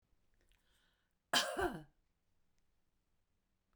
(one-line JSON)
{"cough_length": "3.8 s", "cough_amplitude": 3675, "cough_signal_mean_std_ratio": 0.26, "survey_phase": "beta (2021-08-13 to 2022-03-07)", "age": "65+", "gender": "Female", "wearing_mask": "No", "symptom_none": true, "smoker_status": "Ex-smoker", "respiratory_condition_asthma": false, "respiratory_condition_other": false, "recruitment_source": "REACT", "submission_delay": "0 days", "covid_test_result": "Negative", "covid_test_method": "RT-qPCR"}